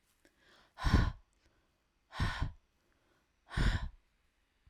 {"exhalation_length": "4.7 s", "exhalation_amplitude": 5612, "exhalation_signal_mean_std_ratio": 0.35, "survey_phase": "alpha (2021-03-01 to 2021-08-12)", "age": "18-44", "gender": "Female", "wearing_mask": "No", "symptom_none": true, "smoker_status": "Current smoker (e-cigarettes or vapes only)", "respiratory_condition_asthma": false, "respiratory_condition_other": false, "recruitment_source": "REACT", "submission_delay": "0 days", "covid_test_result": "Negative", "covid_test_method": "RT-qPCR"}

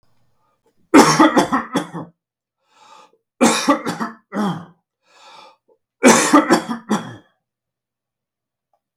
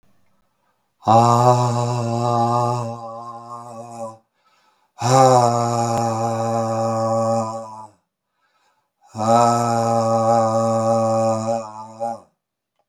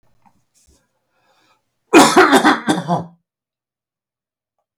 {"three_cough_length": "9.0 s", "three_cough_amplitude": 32768, "three_cough_signal_mean_std_ratio": 0.38, "exhalation_length": "12.9 s", "exhalation_amplitude": 32768, "exhalation_signal_mean_std_ratio": 0.67, "cough_length": "4.8 s", "cough_amplitude": 32768, "cough_signal_mean_std_ratio": 0.33, "survey_phase": "beta (2021-08-13 to 2022-03-07)", "age": "65+", "gender": "Male", "wearing_mask": "No", "symptom_none": true, "smoker_status": "Never smoked", "respiratory_condition_asthma": false, "respiratory_condition_other": false, "recruitment_source": "REACT", "submission_delay": "1 day", "covid_test_result": "Negative", "covid_test_method": "RT-qPCR"}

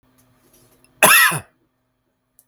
{"cough_length": "2.5 s", "cough_amplitude": 32768, "cough_signal_mean_std_ratio": 0.31, "survey_phase": "beta (2021-08-13 to 2022-03-07)", "age": "18-44", "gender": "Male", "wearing_mask": "No", "symptom_diarrhoea": true, "symptom_fatigue": true, "smoker_status": "Never smoked", "respiratory_condition_asthma": false, "respiratory_condition_other": false, "recruitment_source": "REACT", "submission_delay": "1 day", "covid_test_result": "Negative", "covid_test_method": "RT-qPCR"}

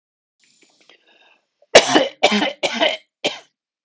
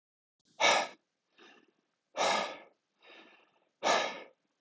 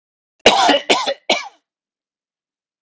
{"three_cough_length": "3.8 s", "three_cough_amplitude": 32768, "three_cough_signal_mean_std_ratio": 0.34, "exhalation_length": "4.6 s", "exhalation_amplitude": 7895, "exhalation_signal_mean_std_ratio": 0.37, "cough_length": "2.8 s", "cough_amplitude": 32768, "cough_signal_mean_std_ratio": 0.38, "survey_phase": "alpha (2021-03-01 to 2021-08-12)", "age": "45-64", "gender": "Male", "wearing_mask": "No", "symptom_none": true, "smoker_status": "Never smoked", "respiratory_condition_asthma": false, "respiratory_condition_other": false, "recruitment_source": "REACT", "submission_delay": "1 day", "covid_test_result": "Negative", "covid_test_method": "RT-qPCR"}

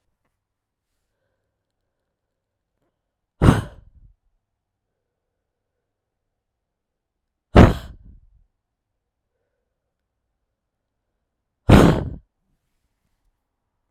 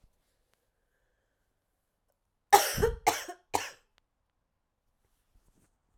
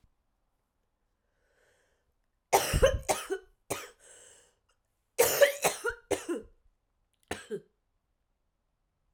{"exhalation_length": "13.9 s", "exhalation_amplitude": 32768, "exhalation_signal_mean_std_ratio": 0.17, "cough_length": "6.0 s", "cough_amplitude": 19508, "cough_signal_mean_std_ratio": 0.21, "three_cough_length": "9.1 s", "three_cough_amplitude": 13414, "three_cough_signal_mean_std_ratio": 0.3, "survey_phase": "alpha (2021-03-01 to 2021-08-12)", "age": "45-64", "gender": "Female", "wearing_mask": "No", "symptom_new_continuous_cough": true, "symptom_shortness_of_breath": true, "symptom_fatigue": true, "symptom_fever_high_temperature": true, "symptom_headache": true, "symptom_change_to_sense_of_smell_or_taste": true, "symptom_loss_of_taste": true, "smoker_status": "Never smoked", "respiratory_condition_asthma": true, "respiratory_condition_other": false, "recruitment_source": "Test and Trace", "submission_delay": "2 days", "covid_test_result": "Positive", "covid_test_method": "RT-qPCR"}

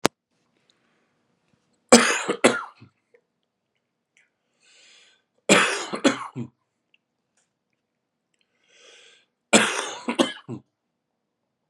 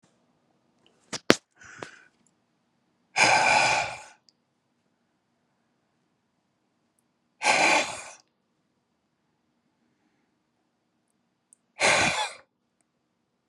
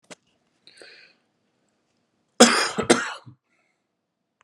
{"three_cough_length": "11.7 s", "three_cough_amplitude": 32768, "three_cough_signal_mean_std_ratio": 0.26, "exhalation_length": "13.5 s", "exhalation_amplitude": 32768, "exhalation_signal_mean_std_ratio": 0.29, "cough_length": "4.4 s", "cough_amplitude": 32767, "cough_signal_mean_std_ratio": 0.24, "survey_phase": "beta (2021-08-13 to 2022-03-07)", "age": "45-64", "gender": "Male", "wearing_mask": "No", "symptom_none": true, "symptom_onset": "12 days", "smoker_status": "Ex-smoker", "respiratory_condition_asthma": true, "respiratory_condition_other": false, "recruitment_source": "REACT", "submission_delay": "4 days", "covid_test_result": "Negative", "covid_test_method": "RT-qPCR"}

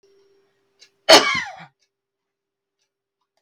{"cough_length": "3.4 s", "cough_amplitude": 32768, "cough_signal_mean_std_ratio": 0.21, "survey_phase": "beta (2021-08-13 to 2022-03-07)", "age": "45-64", "gender": "Female", "wearing_mask": "No", "symptom_none": true, "smoker_status": "Never smoked", "respiratory_condition_asthma": false, "respiratory_condition_other": false, "recruitment_source": "REACT", "submission_delay": "1 day", "covid_test_result": "Negative", "covid_test_method": "RT-qPCR"}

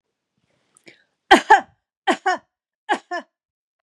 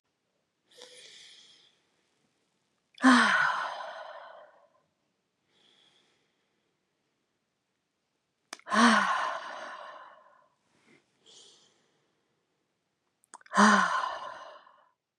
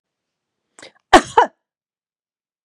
{"three_cough_length": "3.8 s", "three_cough_amplitude": 32767, "three_cough_signal_mean_std_ratio": 0.25, "exhalation_length": "15.2 s", "exhalation_amplitude": 13964, "exhalation_signal_mean_std_ratio": 0.3, "cough_length": "2.6 s", "cough_amplitude": 32768, "cough_signal_mean_std_ratio": 0.19, "survey_phase": "beta (2021-08-13 to 2022-03-07)", "age": "45-64", "gender": "Female", "wearing_mask": "No", "symptom_none": true, "smoker_status": "Never smoked", "respiratory_condition_asthma": false, "respiratory_condition_other": false, "recruitment_source": "REACT", "submission_delay": "3 days", "covid_test_result": "Negative", "covid_test_method": "RT-qPCR", "influenza_a_test_result": "Negative", "influenza_b_test_result": "Negative"}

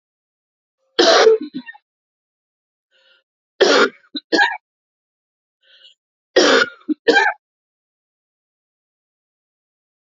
{"three_cough_length": "10.2 s", "three_cough_amplitude": 31100, "three_cough_signal_mean_std_ratio": 0.32, "survey_phase": "beta (2021-08-13 to 2022-03-07)", "age": "45-64", "gender": "Female", "wearing_mask": "No", "symptom_cough_any": true, "symptom_runny_or_blocked_nose": true, "symptom_sore_throat": true, "symptom_fatigue": true, "symptom_fever_high_temperature": true, "symptom_headache": true, "symptom_change_to_sense_of_smell_or_taste": true, "symptom_loss_of_taste": true, "symptom_onset": "6 days", "smoker_status": "Never smoked", "respiratory_condition_asthma": false, "respiratory_condition_other": false, "recruitment_source": "Test and Trace", "submission_delay": "2 days", "covid_test_result": "Positive", "covid_test_method": "RT-qPCR", "covid_ct_value": 16.3, "covid_ct_gene": "ORF1ab gene"}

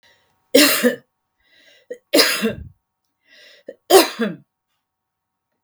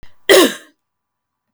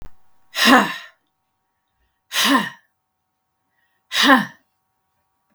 {"three_cough_length": "5.6 s", "three_cough_amplitude": 32768, "three_cough_signal_mean_std_ratio": 0.33, "cough_length": "1.5 s", "cough_amplitude": 32766, "cough_signal_mean_std_ratio": 0.33, "exhalation_length": "5.5 s", "exhalation_amplitude": 32766, "exhalation_signal_mean_std_ratio": 0.34, "survey_phase": "beta (2021-08-13 to 2022-03-07)", "age": "65+", "gender": "Female", "wearing_mask": "No", "symptom_none": true, "smoker_status": "Never smoked", "respiratory_condition_asthma": false, "respiratory_condition_other": false, "recruitment_source": "REACT", "submission_delay": "3 days", "covid_test_result": "Negative", "covid_test_method": "RT-qPCR", "influenza_a_test_result": "Negative", "influenza_b_test_result": "Negative"}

